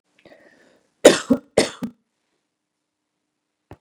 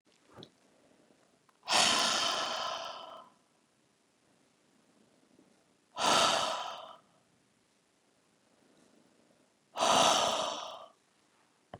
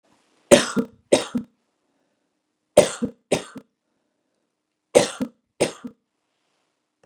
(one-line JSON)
{"cough_length": "3.8 s", "cough_amplitude": 32768, "cough_signal_mean_std_ratio": 0.2, "exhalation_length": "11.8 s", "exhalation_amplitude": 7301, "exhalation_signal_mean_std_ratio": 0.39, "three_cough_length": "7.1 s", "three_cough_amplitude": 32768, "three_cough_signal_mean_std_ratio": 0.24, "survey_phase": "beta (2021-08-13 to 2022-03-07)", "age": "45-64", "gender": "Female", "wearing_mask": "No", "symptom_none": true, "symptom_onset": "12 days", "smoker_status": "Never smoked", "respiratory_condition_asthma": false, "respiratory_condition_other": false, "recruitment_source": "REACT", "submission_delay": "2 days", "covid_test_result": "Negative", "covid_test_method": "RT-qPCR", "influenza_a_test_result": "Unknown/Void", "influenza_b_test_result": "Unknown/Void"}